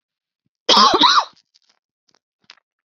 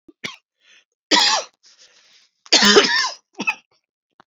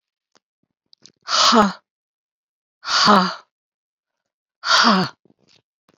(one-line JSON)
{"cough_length": "2.9 s", "cough_amplitude": 31655, "cough_signal_mean_std_ratio": 0.35, "three_cough_length": "4.3 s", "three_cough_amplitude": 32562, "three_cough_signal_mean_std_ratio": 0.38, "exhalation_length": "6.0 s", "exhalation_amplitude": 29174, "exhalation_signal_mean_std_ratio": 0.38, "survey_phase": "beta (2021-08-13 to 2022-03-07)", "age": "45-64", "gender": "Female", "wearing_mask": "No", "symptom_cough_any": true, "symptom_runny_or_blocked_nose": true, "symptom_change_to_sense_of_smell_or_taste": true, "smoker_status": "Never smoked", "respiratory_condition_asthma": false, "respiratory_condition_other": false, "recruitment_source": "Test and Trace", "submission_delay": "3 days", "covid_test_result": "Positive", "covid_test_method": "ePCR"}